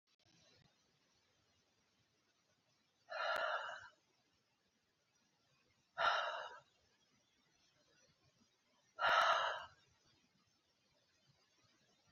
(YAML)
exhalation_length: 12.1 s
exhalation_amplitude: 2817
exhalation_signal_mean_std_ratio: 0.3
survey_phase: beta (2021-08-13 to 2022-03-07)
age: 45-64
gender: Female
wearing_mask: 'No'
symptom_cough_any: true
symptom_runny_or_blocked_nose: true
symptom_diarrhoea: true
symptom_fatigue: true
symptom_headache: true
symptom_change_to_sense_of_smell_or_taste: true
symptom_loss_of_taste: true
symptom_onset: 5 days
smoker_status: Ex-smoker
respiratory_condition_asthma: false
respiratory_condition_other: false
recruitment_source: Test and Trace
submission_delay: 2 days
covid_test_result: Positive
covid_test_method: RT-qPCR